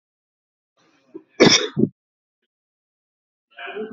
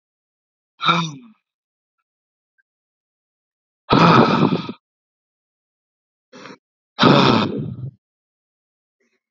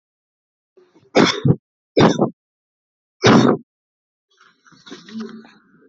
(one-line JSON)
{"cough_length": "3.9 s", "cough_amplitude": 28380, "cough_signal_mean_std_ratio": 0.25, "exhalation_length": "9.3 s", "exhalation_amplitude": 31274, "exhalation_signal_mean_std_ratio": 0.33, "three_cough_length": "5.9 s", "three_cough_amplitude": 30532, "three_cough_signal_mean_std_ratio": 0.33, "survey_phase": "alpha (2021-03-01 to 2021-08-12)", "age": "18-44", "gender": "Male", "wearing_mask": "Yes", "symptom_none": true, "smoker_status": "Ex-smoker", "respiratory_condition_asthma": false, "respiratory_condition_other": false, "recruitment_source": "REACT", "submission_delay": "1 day", "covid_test_result": "Negative", "covid_test_method": "RT-qPCR"}